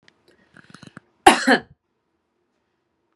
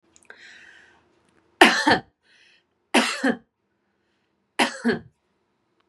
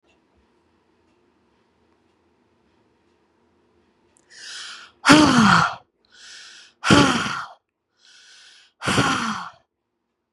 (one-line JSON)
{"cough_length": "3.2 s", "cough_amplitude": 32768, "cough_signal_mean_std_ratio": 0.21, "three_cough_length": "5.9 s", "three_cough_amplitude": 32768, "three_cough_signal_mean_std_ratio": 0.29, "exhalation_length": "10.3 s", "exhalation_amplitude": 32767, "exhalation_signal_mean_std_ratio": 0.32, "survey_phase": "beta (2021-08-13 to 2022-03-07)", "age": "45-64", "gender": "Female", "wearing_mask": "Yes", "symptom_none": true, "smoker_status": "Never smoked", "respiratory_condition_asthma": false, "respiratory_condition_other": false, "recruitment_source": "REACT", "submission_delay": "2 days", "covid_test_result": "Negative", "covid_test_method": "RT-qPCR"}